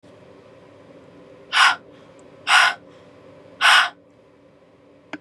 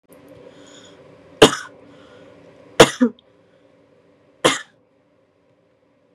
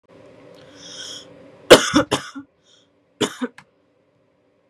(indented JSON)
{
  "exhalation_length": "5.2 s",
  "exhalation_amplitude": 28214,
  "exhalation_signal_mean_std_ratio": 0.34,
  "three_cough_length": "6.1 s",
  "three_cough_amplitude": 32768,
  "three_cough_signal_mean_std_ratio": 0.21,
  "cough_length": "4.7 s",
  "cough_amplitude": 32768,
  "cough_signal_mean_std_ratio": 0.24,
  "survey_phase": "beta (2021-08-13 to 2022-03-07)",
  "age": "18-44",
  "gender": "Female",
  "wearing_mask": "No",
  "symptom_cough_any": true,
  "symptom_runny_or_blocked_nose": true,
  "smoker_status": "Never smoked",
  "respiratory_condition_asthma": false,
  "respiratory_condition_other": false,
  "recruitment_source": "REACT",
  "submission_delay": "2 days",
  "covid_test_result": "Negative",
  "covid_test_method": "RT-qPCR",
  "influenza_a_test_result": "Negative",
  "influenza_b_test_result": "Negative"
}